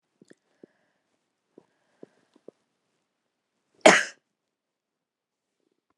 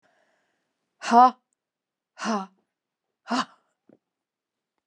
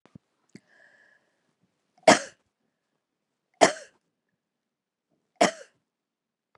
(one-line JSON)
{"cough_length": "6.0 s", "cough_amplitude": 31195, "cough_signal_mean_std_ratio": 0.13, "exhalation_length": "4.9 s", "exhalation_amplitude": 22520, "exhalation_signal_mean_std_ratio": 0.22, "three_cough_length": "6.6 s", "three_cough_amplitude": 27551, "three_cough_signal_mean_std_ratio": 0.16, "survey_phase": "alpha (2021-03-01 to 2021-08-12)", "age": "65+", "gender": "Female", "wearing_mask": "No", "symptom_none": true, "smoker_status": "Never smoked", "respiratory_condition_asthma": false, "respiratory_condition_other": false, "recruitment_source": "REACT", "submission_delay": "32 days", "covid_test_result": "Negative", "covid_test_method": "RT-qPCR"}